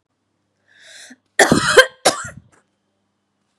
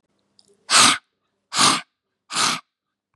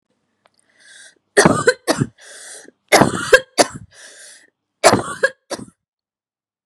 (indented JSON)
{
  "cough_length": "3.6 s",
  "cough_amplitude": 32768,
  "cough_signal_mean_std_ratio": 0.29,
  "exhalation_length": "3.2 s",
  "exhalation_amplitude": 30875,
  "exhalation_signal_mean_std_ratio": 0.38,
  "three_cough_length": "6.7 s",
  "three_cough_amplitude": 32768,
  "three_cough_signal_mean_std_ratio": 0.32,
  "survey_phase": "beta (2021-08-13 to 2022-03-07)",
  "age": "45-64",
  "gender": "Female",
  "wearing_mask": "No",
  "symptom_none": true,
  "smoker_status": "Ex-smoker",
  "respiratory_condition_asthma": false,
  "respiratory_condition_other": false,
  "recruitment_source": "REACT",
  "submission_delay": "2 days",
  "covid_test_result": "Negative",
  "covid_test_method": "RT-qPCR",
  "influenza_a_test_result": "Negative",
  "influenza_b_test_result": "Negative"
}